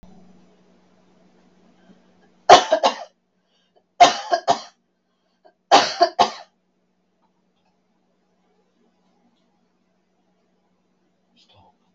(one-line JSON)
{"three_cough_length": "11.9 s", "three_cough_amplitude": 32768, "three_cough_signal_mean_std_ratio": 0.21, "survey_phase": "beta (2021-08-13 to 2022-03-07)", "age": "65+", "gender": "Female", "wearing_mask": "No", "symptom_none": true, "smoker_status": "Never smoked", "respiratory_condition_asthma": false, "respiratory_condition_other": false, "recruitment_source": "REACT", "submission_delay": "2 days", "covid_test_result": "Negative", "covid_test_method": "RT-qPCR", "influenza_a_test_result": "Negative", "influenza_b_test_result": "Negative"}